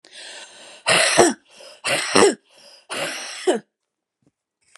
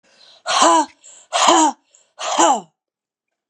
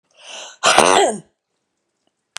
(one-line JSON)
{"three_cough_length": "4.8 s", "three_cough_amplitude": 32768, "three_cough_signal_mean_std_ratio": 0.42, "exhalation_length": "3.5 s", "exhalation_amplitude": 32713, "exhalation_signal_mean_std_ratio": 0.48, "cough_length": "2.4 s", "cough_amplitude": 32768, "cough_signal_mean_std_ratio": 0.37, "survey_phase": "beta (2021-08-13 to 2022-03-07)", "age": "45-64", "gender": "Female", "wearing_mask": "No", "symptom_cough_any": true, "symptom_runny_or_blocked_nose": true, "symptom_fever_high_temperature": true, "symptom_change_to_sense_of_smell_or_taste": true, "symptom_loss_of_taste": true, "symptom_onset": "2 days", "smoker_status": "Never smoked", "respiratory_condition_asthma": false, "respiratory_condition_other": false, "recruitment_source": "Test and Trace", "submission_delay": "2 days", "covid_test_result": "Positive", "covid_test_method": "RT-qPCR", "covid_ct_value": 12.2, "covid_ct_gene": "ORF1ab gene", "covid_ct_mean": 12.6, "covid_viral_load": "73000000 copies/ml", "covid_viral_load_category": "High viral load (>1M copies/ml)"}